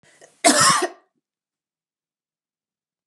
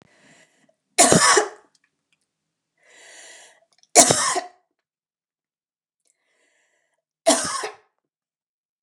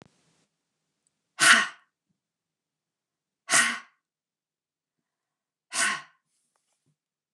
{
  "cough_length": "3.1 s",
  "cough_amplitude": 28058,
  "cough_signal_mean_std_ratio": 0.3,
  "three_cough_length": "8.8 s",
  "three_cough_amplitude": 29204,
  "three_cough_signal_mean_std_ratio": 0.28,
  "exhalation_length": "7.3 s",
  "exhalation_amplitude": 20411,
  "exhalation_signal_mean_std_ratio": 0.23,
  "survey_phase": "beta (2021-08-13 to 2022-03-07)",
  "age": "45-64",
  "gender": "Female",
  "wearing_mask": "No",
  "symptom_cough_any": true,
  "symptom_runny_or_blocked_nose": true,
  "symptom_shortness_of_breath": true,
  "symptom_sore_throat": true,
  "symptom_fatigue": true,
  "symptom_headache": true,
  "symptom_change_to_sense_of_smell_or_taste": true,
  "symptom_onset": "3 days",
  "smoker_status": "Ex-smoker",
  "respiratory_condition_asthma": false,
  "respiratory_condition_other": false,
  "recruitment_source": "Test and Trace",
  "submission_delay": "1 day",
  "covid_test_result": "Positive",
  "covid_test_method": "RT-qPCR",
  "covid_ct_value": 19.8,
  "covid_ct_gene": "N gene"
}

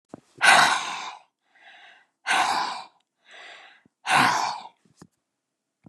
{
  "exhalation_length": "5.9 s",
  "exhalation_amplitude": 27405,
  "exhalation_signal_mean_std_ratio": 0.4,
  "survey_phase": "beta (2021-08-13 to 2022-03-07)",
  "age": "65+",
  "gender": "Female",
  "wearing_mask": "No",
  "symptom_none": true,
  "smoker_status": "Ex-smoker",
  "respiratory_condition_asthma": false,
  "respiratory_condition_other": false,
  "recruitment_source": "REACT",
  "submission_delay": "4 days",
  "covid_test_result": "Negative",
  "covid_test_method": "RT-qPCR",
  "influenza_a_test_result": "Negative",
  "influenza_b_test_result": "Negative"
}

